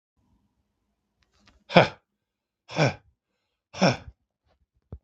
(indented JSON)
{
  "exhalation_length": "5.0 s",
  "exhalation_amplitude": 32766,
  "exhalation_signal_mean_std_ratio": 0.21,
  "survey_phase": "beta (2021-08-13 to 2022-03-07)",
  "age": "45-64",
  "gender": "Male",
  "wearing_mask": "No",
  "symptom_cough_any": true,
  "symptom_runny_or_blocked_nose": true,
  "symptom_fatigue": true,
  "symptom_headache": true,
  "symptom_change_to_sense_of_smell_or_taste": true,
  "smoker_status": "Never smoked",
  "respiratory_condition_asthma": true,
  "respiratory_condition_other": false,
  "recruitment_source": "Test and Trace",
  "submission_delay": "1 day",
  "covid_test_result": "Positive",
  "covid_test_method": "LFT"
}